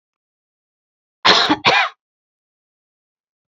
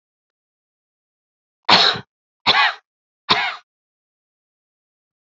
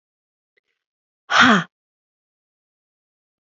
{
  "cough_length": "3.5 s",
  "cough_amplitude": 29492,
  "cough_signal_mean_std_ratio": 0.31,
  "three_cough_length": "5.2 s",
  "three_cough_amplitude": 30288,
  "three_cough_signal_mean_std_ratio": 0.29,
  "exhalation_length": "3.4 s",
  "exhalation_amplitude": 30980,
  "exhalation_signal_mean_std_ratio": 0.24,
  "survey_phase": "beta (2021-08-13 to 2022-03-07)",
  "age": "45-64",
  "gender": "Female",
  "wearing_mask": "No",
  "symptom_change_to_sense_of_smell_or_taste": true,
  "symptom_onset": "3 days",
  "smoker_status": "Never smoked",
  "respiratory_condition_asthma": false,
  "respiratory_condition_other": false,
  "recruitment_source": "Test and Trace",
  "submission_delay": "2 days",
  "covid_test_result": "Positive",
  "covid_test_method": "RT-qPCR",
  "covid_ct_value": 21.2,
  "covid_ct_gene": "ORF1ab gene"
}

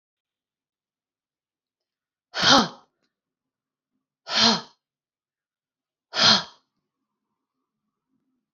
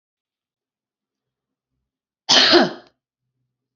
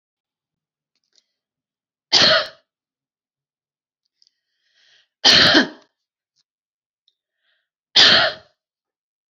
{
  "exhalation_length": "8.5 s",
  "exhalation_amplitude": 28075,
  "exhalation_signal_mean_std_ratio": 0.24,
  "cough_length": "3.8 s",
  "cough_amplitude": 30426,
  "cough_signal_mean_std_ratio": 0.26,
  "three_cough_length": "9.3 s",
  "three_cough_amplitude": 31999,
  "three_cough_signal_mean_std_ratio": 0.27,
  "survey_phase": "beta (2021-08-13 to 2022-03-07)",
  "age": "45-64",
  "gender": "Female",
  "wearing_mask": "No",
  "symptom_none": true,
  "symptom_onset": "12 days",
  "smoker_status": "Never smoked",
  "respiratory_condition_asthma": true,
  "respiratory_condition_other": false,
  "recruitment_source": "REACT",
  "submission_delay": "1 day",
  "covid_test_result": "Negative",
  "covid_test_method": "RT-qPCR"
}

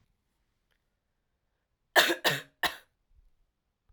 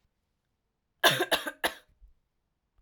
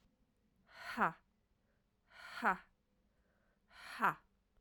{
  "three_cough_length": "3.9 s",
  "three_cough_amplitude": 18634,
  "three_cough_signal_mean_std_ratio": 0.24,
  "cough_length": "2.8 s",
  "cough_amplitude": 15165,
  "cough_signal_mean_std_ratio": 0.28,
  "exhalation_length": "4.6 s",
  "exhalation_amplitude": 3768,
  "exhalation_signal_mean_std_ratio": 0.27,
  "survey_phase": "alpha (2021-03-01 to 2021-08-12)",
  "age": "18-44",
  "gender": "Female",
  "wearing_mask": "No",
  "symptom_cough_any": true,
  "symptom_new_continuous_cough": true,
  "symptom_shortness_of_breath": true,
  "symptom_fatigue": true,
  "symptom_fever_high_temperature": true,
  "symptom_change_to_sense_of_smell_or_taste": true,
  "symptom_loss_of_taste": true,
  "symptom_onset": "4 days",
  "smoker_status": "Never smoked",
  "respiratory_condition_asthma": true,
  "respiratory_condition_other": true,
  "recruitment_source": "Test and Trace",
  "submission_delay": "1 day",
  "covid_test_result": "Positive",
  "covid_test_method": "RT-qPCR",
  "covid_ct_value": 15.7,
  "covid_ct_gene": "ORF1ab gene",
  "covid_ct_mean": 16.5,
  "covid_viral_load": "4000000 copies/ml",
  "covid_viral_load_category": "High viral load (>1M copies/ml)"
}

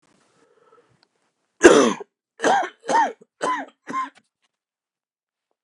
{
  "three_cough_length": "5.6 s",
  "three_cough_amplitude": 32768,
  "three_cough_signal_mean_std_ratio": 0.31,
  "survey_phase": "beta (2021-08-13 to 2022-03-07)",
  "age": "45-64",
  "gender": "Male",
  "wearing_mask": "No",
  "symptom_cough_any": true,
  "symptom_runny_or_blocked_nose": true,
  "symptom_sore_throat": true,
  "symptom_headache": true,
  "symptom_onset": "5 days",
  "smoker_status": "Never smoked",
  "respiratory_condition_asthma": false,
  "respiratory_condition_other": false,
  "recruitment_source": "Test and Trace",
  "submission_delay": "2 days",
  "covid_test_result": "Positive",
  "covid_test_method": "RT-qPCR"
}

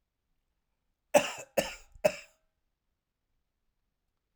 {
  "cough_length": "4.4 s",
  "cough_amplitude": 12335,
  "cough_signal_mean_std_ratio": 0.2,
  "survey_phase": "alpha (2021-03-01 to 2021-08-12)",
  "age": "65+",
  "gender": "Male",
  "wearing_mask": "No",
  "symptom_none": true,
  "smoker_status": "Ex-smoker",
  "respiratory_condition_asthma": false,
  "respiratory_condition_other": false,
  "recruitment_source": "REACT",
  "submission_delay": "6 days",
  "covid_test_result": "Negative",
  "covid_test_method": "RT-qPCR"
}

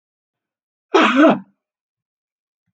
{
  "cough_length": "2.7 s",
  "cough_amplitude": 30466,
  "cough_signal_mean_std_ratio": 0.32,
  "survey_phase": "beta (2021-08-13 to 2022-03-07)",
  "age": "65+",
  "gender": "Female",
  "wearing_mask": "No",
  "symptom_cough_any": true,
  "smoker_status": "Ex-smoker",
  "respiratory_condition_asthma": false,
  "respiratory_condition_other": false,
  "recruitment_source": "REACT",
  "submission_delay": "1 day",
  "covid_test_result": "Negative",
  "covid_test_method": "RT-qPCR",
  "influenza_a_test_result": "Negative",
  "influenza_b_test_result": "Negative"
}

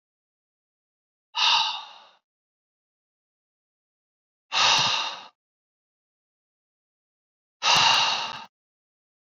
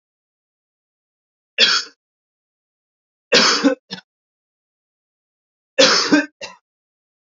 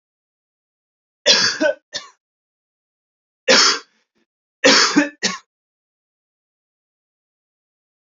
{
  "exhalation_length": "9.4 s",
  "exhalation_amplitude": 15477,
  "exhalation_signal_mean_std_ratio": 0.34,
  "three_cough_length": "7.3 s",
  "three_cough_amplitude": 31992,
  "three_cough_signal_mean_std_ratio": 0.31,
  "cough_length": "8.1 s",
  "cough_amplitude": 32027,
  "cough_signal_mean_std_ratio": 0.31,
  "survey_phase": "beta (2021-08-13 to 2022-03-07)",
  "age": "18-44",
  "gender": "Male",
  "wearing_mask": "No",
  "symptom_cough_any": true,
  "symptom_runny_or_blocked_nose": true,
  "symptom_sore_throat": true,
  "smoker_status": "Ex-smoker",
  "respiratory_condition_asthma": false,
  "respiratory_condition_other": false,
  "recruitment_source": "REACT",
  "submission_delay": "2 days",
  "covid_test_result": "Negative",
  "covid_test_method": "RT-qPCR",
  "influenza_a_test_result": "Negative",
  "influenza_b_test_result": "Negative"
}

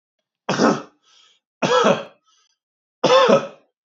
{
  "three_cough_length": "3.8 s",
  "three_cough_amplitude": 27448,
  "three_cough_signal_mean_std_ratio": 0.43,
  "survey_phase": "beta (2021-08-13 to 2022-03-07)",
  "age": "45-64",
  "gender": "Male",
  "wearing_mask": "No",
  "symptom_none": true,
  "smoker_status": "Never smoked",
  "respiratory_condition_asthma": false,
  "respiratory_condition_other": false,
  "recruitment_source": "REACT",
  "submission_delay": "1 day",
  "covid_test_result": "Negative",
  "covid_test_method": "RT-qPCR",
  "influenza_a_test_result": "Negative",
  "influenza_b_test_result": "Negative"
}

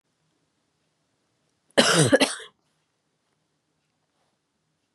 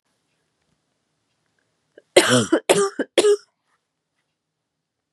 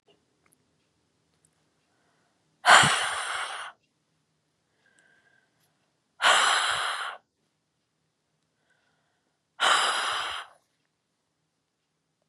{
  "cough_length": "4.9 s",
  "cough_amplitude": 29221,
  "cough_signal_mean_std_ratio": 0.24,
  "three_cough_length": "5.1 s",
  "three_cough_amplitude": 32569,
  "three_cough_signal_mean_std_ratio": 0.31,
  "exhalation_length": "12.3 s",
  "exhalation_amplitude": 27582,
  "exhalation_signal_mean_std_ratio": 0.31,
  "survey_phase": "beta (2021-08-13 to 2022-03-07)",
  "age": "18-44",
  "gender": "Female",
  "wearing_mask": "No",
  "symptom_cough_any": true,
  "smoker_status": "Never smoked",
  "respiratory_condition_asthma": false,
  "respiratory_condition_other": false,
  "recruitment_source": "REACT",
  "submission_delay": "13 days",
  "covid_test_result": "Negative",
  "covid_test_method": "RT-qPCR",
  "influenza_a_test_result": "Negative",
  "influenza_b_test_result": "Negative"
}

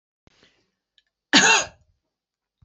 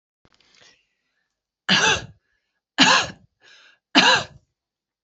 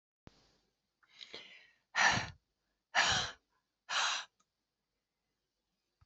{
  "cough_length": "2.6 s",
  "cough_amplitude": 27629,
  "cough_signal_mean_std_ratio": 0.27,
  "three_cough_length": "5.0 s",
  "three_cough_amplitude": 28270,
  "three_cough_signal_mean_std_ratio": 0.33,
  "exhalation_length": "6.1 s",
  "exhalation_amplitude": 5573,
  "exhalation_signal_mean_std_ratio": 0.32,
  "survey_phase": "alpha (2021-03-01 to 2021-08-12)",
  "age": "45-64",
  "gender": "Female",
  "wearing_mask": "No",
  "symptom_none": true,
  "smoker_status": "Never smoked",
  "respiratory_condition_asthma": false,
  "respiratory_condition_other": false,
  "recruitment_source": "REACT",
  "submission_delay": "3 days",
  "covid_test_result": "Negative",
  "covid_test_method": "RT-qPCR"
}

